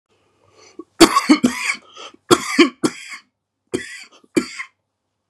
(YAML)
three_cough_length: 5.3 s
three_cough_amplitude: 32768
three_cough_signal_mean_std_ratio: 0.33
survey_phase: beta (2021-08-13 to 2022-03-07)
age: 45-64
gender: Male
wearing_mask: 'No'
symptom_none: true
smoker_status: Ex-smoker
respiratory_condition_asthma: false
respiratory_condition_other: false
recruitment_source: REACT
submission_delay: 2 days
covid_test_result: Negative
covid_test_method: RT-qPCR
influenza_a_test_result: Negative
influenza_b_test_result: Negative